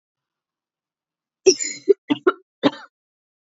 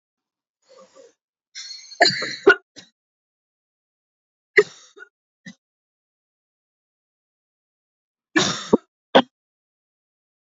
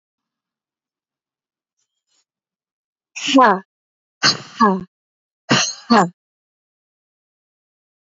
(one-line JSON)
{"cough_length": "3.5 s", "cough_amplitude": 28570, "cough_signal_mean_std_ratio": 0.24, "three_cough_length": "10.5 s", "three_cough_amplitude": 28067, "three_cough_signal_mean_std_ratio": 0.2, "exhalation_length": "8.1 s", "exhalation_amplitude": 28635, "exhalation_signal_mean_std_ratio": 0.28, "survey_phase": "beta (2021-08-13 to 2022-03-07)", "age": "18-44", "gender": "Female", "wearing_mask": "No", "symptom_cough_any": true, "symptom_runny_or_blocked_nose": true, "symptom_sore_throat": true, "symptom_fatigue": true, "symptom_fever_high_temperature": true, "symptom_headache": true, "symptom_other": true, "symptom_onset": "3 days", "smoker_status": "Never smoked", "respiratory_condition_asthma": false, "respiratory_condition_other": false, "recruitment_source": "Test and Trace", "submission_delay": "1 day", "covid_test_result": "Positive", "covid_test_method": "RT-qPCR", "covid_ct_value": 18.6, "covid_ct_gene": "ORF1ab gene", "covid_ct_mean": 19.1, "covid_viral_load": "520000 copies/ml", "covid_viral_load_category": "Low viral load (10K-1M copies/ml)"}